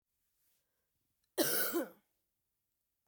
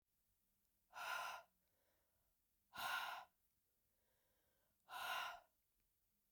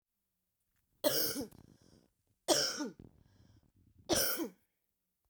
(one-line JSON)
{"cough_length": "3.1 s", "cough_amplitude": 4236, "cough_signal_mean_std_ratio": 0.32, "exhalation_length": "6.3 s", "exhalation_amplitude": 626, "exhalation_signal_mean_std_ratio": 0.41, "three_cough_length": "5.3 s", "three_cough_amplitude": 6291, "three_cough_signal_mean_std_ratio": 0.38, "survey_phase": "beta (2021-08-13 to 2022-03-07)", "age": "45-64", "gender": "Female", "wearing_mask": "No", "symptom_cough_any": true, "symptom_new_continuous_cough": true, "symptom_runny_or_blocked_nose": true, "symptom_fatigue": true, "symptom_other": true, "smoker_status": "Ex-smoker", "respiratory_condition_asthma": false, "respiratory_condition_other": false, "recruitment_source": "Test and Trace", "submission_delay": "1 day", "covid_test_result": "Positive", "covid_test_method": "LFT"}